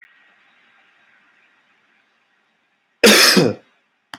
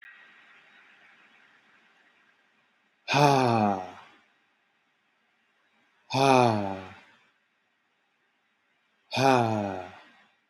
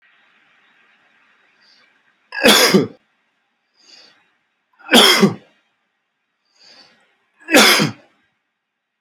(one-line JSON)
{"cough_length": "4.2 s", "cough_amplitude": 32768, "cough_signal_mean_std_ratio": 0.28, "exhalation_length": "10.5 s", "exhalation_amplitude": 15846, "exhalation_signal_mean_std_ratio": 0.33, "three_cough_length": "9.0 s", "three_cough_amplitude": 32768, "three_cough_signal_mean_std_ratio": 0.3, "survey_phase": "beta (2021-08-13 to 2022-03-07)", "age": "18-44", "gender": "Male", "wearing_mask": "No", "symptom_runny_or_blocked_nose": true, "smoker_status": "Never smoked", "respiratory_condition_asthma": false, "respiratory_condition_other": false, "recruitment_source": "REACT", "submission_delay": "0 days", "covid_test_result": "Negative", "covid_test_method": "RT-qPCR", "influenza_a_test_result": "Negative", "influenza_b_test_result": "Negative"}